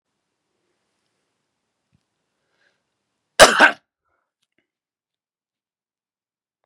{"cough_length": "6.7 s", "cough_amplitude": 32768, "cough_signal_mean_std_ratio": 0.15, "survey_phase": "beta (2021-08-13 to 2022-03-07)", "age": "45-64", "gender": "Male", "wearing_mask": "No", "symptom_cough_any": true, "symptom_runny_or_blocked_nose": true, "symptom_sore_throat": true, "symptom_fatigue": true, "symptom_headache": true, "symptom_other": true, "symptom_onset": "2 days", "smoker_status": "Never smoked", "respiratory_condition_asthma": false, "respiratory_condition_other": false, "recruitment_source": "Test and Trace", "submission_delay": "1 day", "covid_test_result": "Positive", "covid_test_method": "RT-qPCR", "covid_ct_value": 24.2, "covid_ct_gene": "N gene"}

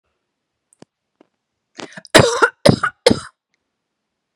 {"cough_length": "4.4 s", "cough_amplitude": 32768, "cough_signal_mean_std_ratio": 0.26, "survey_phase": "beta (2021-08-13 to 2022-03-07)", "age": "18-44", "gender": "Female", "wearing_mask": "No", "symptom_none": true, "smoker_status": "Never smoked", "respiratory_condition_asthma": false, "respiratory_condition_other": false, "recruitment_source": "REACT", "submission_delay": "0 days", "covid_test_result": "Negative", "covid_test_method": "RT-qPCR"}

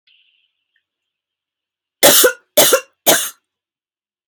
{"three_cough_length": "4.3 s", "three_cough_amplitude": 32768, "three_cough_signal_mean_std_ratio": 0.32, "survey_phase": "alpha (2021-03-01 to 2021-08-12)", "age": "45-64", "gender": "Female", "wearing_mask": "No", "symptom_none": true, "smoker_status": "Never smoked", "respiratory_condition_asthma": true, "respiratory_condition_other": false, "recruitment_source": "REACT", "submission_delay": "1 day", "covid_test_result": "Negative", "covid_test_method": "RT-qPCR"}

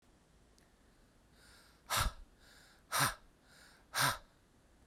{"exhalation_length": "4.9 s", "exhalation_amplitude": 3929, "exhalation_signal_mean_std_ratio": 0.34, "survey_phase": "beta (2021-08-13 to 2022-03-07)", "age": "45-64", "gender": "Male", "wearing_mask": "No", "symptom_fatigue": true, "smoker_status": "Ex-smoker", "respiratory_condition_asthma": false, "respiratory_condition_other": false, "recruitment_source": "REACT", "submission_delay": "4 days", "covid_test_result": "Negative", "covid_test_method": "RT-qPCR"}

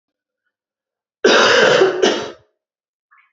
{"cough_length": "3.3 s", "cough_amplitude": 32290, "cough_signal_mean_std_ratio": 0.46, "survey_phase": "beta (2021-08-13 to 2022-03-07)", "age": "18-44", "gender": "Female", "wearing_mask": "No", "symptom_new_continuous_cough": true, "symptom_runny_or_blocked_nose": true, "symptom_sore_throat": true, "symptom_change_to_sense_of_smell_or_taste": true, "symptom_loss_of_taste": true, "symptom_other": true, "symptom_onset": "3 days", "smoker_status": "Never smoked", "respiratory_condition_asthma": false, "respiratory_condition_other": false, "recruitment_source": "Test and Trace", "submission_delay": "1 day", "covid_test_result": "Positive", "covid_test_method": "RT-qPCR", "covid_ct_value": 27.5, "covid_ct_gene": "N gene"}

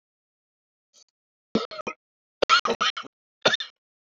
{"cough_length": "4.0 s", "cough_amplitude": 26125, "cough_signal_mean_std_ratio": 0.29, "survey_phase": "beta (2021-08-13 to 2022-03-07)", "age": "45-64", "gender": "Male", "wearing_mask": "No", "symptom_cough_any": true, "symptom_sore_throat": true, "symptom_fatigue": true, "symptom_headache": true, "symptom_other": true, "smoker_status": "Never smoked", "respiratory_condition_asthma": false, "respiratory_condition_other": false, "recruitment_source": "Test and Trace", "submission_delay": "2 days", "covid_test_result": "Positive", "covid_test_method": "RT-qPCR"}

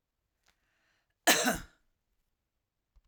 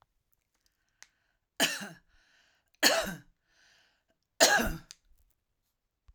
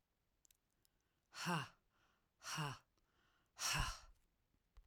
{"cough_length": "3.1 s", "cough_amplitude": 10189, "cough_signal_mean_std_ratio": 0.23, "three_cough_length": "6.1 s", "three_cough_amplitude": 14509, "three_cough_signal_mean_std_ratio": 0.28, "exhalation_length": "4.9 s", "exhalation_amplitude": 1633, "exhalation_signal_mean_std_ratio": 0.38, "survey_phase": "alpha (2021-03-01 to 2021-08-12)", "age": "65+", "gender": "Female", "wearing_mask": "No", "symptom_none": true, "smoker_status": "Ex-smoker", "respiratory_condition_asthma": false, "respiratory_condition_other": false, "recruitment_source": "REACT", "submission_delay": "2 days", "covid_test_result": "Negative", "covid_test_method": "RT-qPCR"}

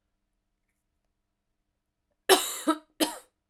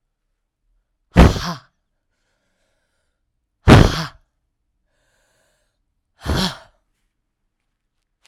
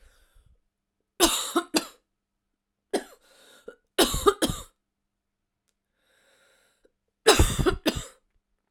{"cough_length": "3.5 s", "cough_amplitude": 18033, "cough_signal_mean_std_ratio": 0.24, "exhalation_length": "8.3 s", "exhalation_amplitude": 32768, "exhalation_signal_mean_std_ratio": 0.22, "three_cough_length": "8.7 s", "three_cough_amplitude": 24131, "three_cough_signal_mean_std_ratio": 0.3, "survey_phase": "beta (2021-08-13 to 2022-03-07)", "age": "45-64", "gender": "Female", "wearing_mask": "No", "symptom_cough_any": true, "symptom_runny_or_blocked_nose": true, "symptom_shortness_of_breath": true, "symptom_sore_throat": true, "symptom_headache": true, "symptom_onset": "4 days", "smoker_status": "Ex-smoker", "respiratory_condition_asthma": true, "respiratory_condition_other": false, "recruitment_source": "REACT", "submission_delay": "1 day", "covid_test_result": "Negative", "covid_test_method": "RT-qPCR"}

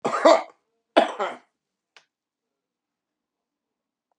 {"cough_length": "4.2 s", "cough_amplitude": 25765, "cough_signal_mean_std_ratio": 0.26, "survey_phase": "beta (2021-08-13 to 2022-03-07)", "age": "65+", "gender": "Male", "wearing_mask": "No", "symptom_cough_any": true, "symptom_runny_or_blocked_nose": true, "symptom_abdominal_pain": true, "symptom_fatigue": true, "symptom_headache": true, "symptom_onset": "6 days", "smoker_status": "Ex-smoker", "respiratory_condition_asthma": false, "respiratory_condition_other": false, "recruitment_source": "REACT", "submission_delay": "1 day", "covid_test_result": "Negative", "covid_test_method": "RT-qPCR", "influenza_a_test_result": "Negative", "influenza_b_test_result": "Negative"}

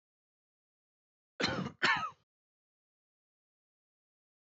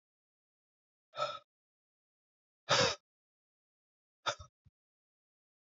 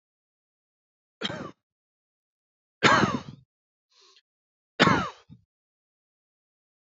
{"cough_length": "4.4 s", "cough_amplitude": 5664, "cough_signal_mean_std_ratio": 0.26, "exhalation_length": "5.7 s", "exhalation_amplitude": 5306, "exhalation_signal_mean_std_ratio": 0.22, "three_cough_length": "6.8 s", "three_cough_amplitude": 20210, "three_cough_signal_mean_std_ratio": 0.25, "survey_phase": "beta (2021-08-13 to 2022-03-07)", "age": "18-44", "gender": "Male", "wearing_mask": "No", "symptom_cough_any": true, "symptom_runny_or_blocked_nose": true, "symptom_sore_throat": true, "symptom_abdominal_pain": true, "symptom_fatigue": true, "symptom_fever_high_temperature": true, "symptom_headache": true, "symptom_loss_of_taste": true, "symptom_onset": "6 days", "smoker_status": "Current smoker (11 or more cigarettes per day)", "respiratory_condition_asthma": false, "respiratory_condition_other": false, "recruitment_source": "Test and Trace", "submission_delay": "1 day", "covid_test_result": "Positive", "covid_test_method": "ePCR"}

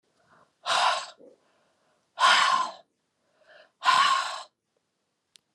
{"exhalation_length": "5.5 s", "exhalation_amplitude": 13946, "exhalation_signal_mean_std_ratio": 0.41, "survey_phase": "alpha (2021-03-01 to 2021-08-12)", "age": "45-64", "gender": "Female", "wearing_mask": "No", "symptom_none": true, "symptom_onset": "12 days", "smoker_status": "Never smoked", "respiratory_condition_asthma": false, "respiratory_condition_other": false, "recruitment_source": "REACT", "submission_delay": "2 days", "covid_test_result": "Negative", "covid_test_method": "RT-qPCR"}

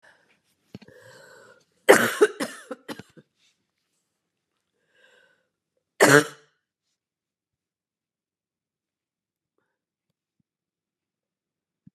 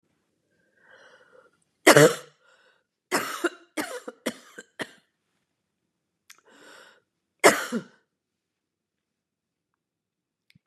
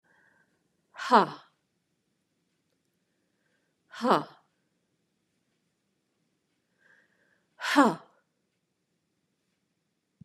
{"cough_length": "11.9 s", "cough_amplitude": 31976, "cough_signal_mean_std_ratio": 0.17, "three_cough_length": "10.7 s", "three_cough_amplitude": 31604, "three_cough_signal_mean_std_ratio": 0.2, "exhalation_length": "10.2 s", "exhalation_amplitude": 16508, "exhalation_signal_mean_std_ratio": 0.19, "survey_phase": "beta (2021-08-13 to 2022-03-07)", "age": "45-64", "gender": "Female", "wearing_mask": "No", "symptom_cough_any": true, "symptom_runny_or_blocked_nose": true, "symptom_sore_throat": true, "symptom_fatigue": true, "symptom_onset": "4 days", "smoker_status": "Ex-smoker", "respiratory_condition_asthma": false, "respiratory_condition_other": false, "recruitment_source": "Test and Trace", "submission_delay": "2 days", "covid_test_result": "Positive", "covid_test_method": "RT-qPCR", "covid_ct_value": 16.2, "covid_ct_gene": "N gene"}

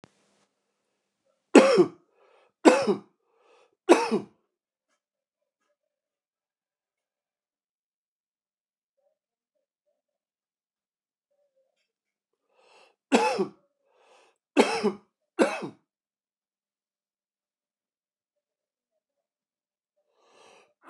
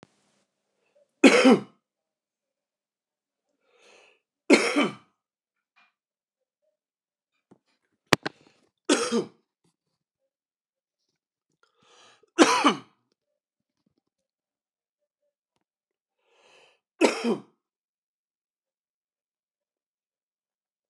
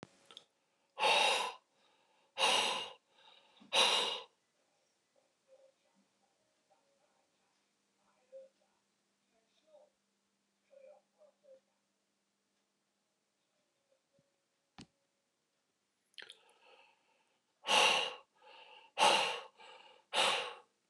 {"three_cough_length": "20.9 s", "three_cough_amplitude": 28833, "three_cough_signal_mean_std_ratio": 0.2, "cough_length": "20.9 s", "cough_amplitude": 29204, "cough_signal_mean_std_ratio": 0.2, "exhalation_length": "20.9 s", "exhalation_amplitude": 5580, "exhalation_signal_mean_std_ratio": 0.29, "survey_phase": "beta (2021-08-13 to 2022-03-07)", "age": "45-64", "gender": "Male", "wearing_mask": "No", "symptom_cough_any": true, "symptom_new_continuous_cough": true, "symptom_runny_or_blocked_nose": true, "symptom_shortness_of_breath": true, "symptom_fatigue": true, "symptom_headache": true, "symptom_change_to_sense_of_smell_or_taste": true, "symptom_loss_of_taste": true, "symptom_onset": "5 days", "smoker_status": "Current smoker (e-cigarettes or vapes only)", "respiratory_condition_asthma": false, "respiratory_condition_other": false, "recruitment_source": "Test and Trace", "submission_delay": "3 days", "covid_test_result": "Positive", "covid_test_method": "RT-qPCR"}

